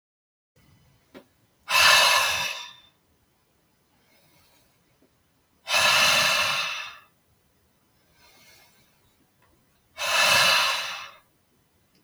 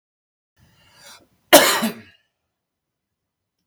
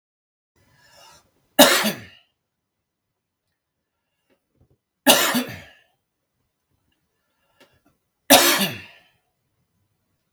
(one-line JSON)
{"exhalation_length": "12.0 s", "exhalation_amplitude": 19027, "exhalation_signal_mean_std_ratio": 0.41, "cough_length": "3.7 s", "cough_amplitude": 32768, "cough_signal_mean_std_ratio": 0.22, "three_cough_length": "10.3 s", "three_cough_amplitude": 32768, "three_cough_signal_mean_std_ratio": 0.24, "survey_phase": "beta (2021-08-13 to 2022-03-07)", "age": "45-64", "gender": "Male", "wearing_mask": "No", "symptom_none": true, "smoker_status": "Never smoked", "respiratory_condition_asthma": false, "respiratory_condition_other": false, "recruitment_source": "REACT", "submission_delay": "2 days", "covid_test_result": "Negative", "covid_test_method": "RT-qPCR"}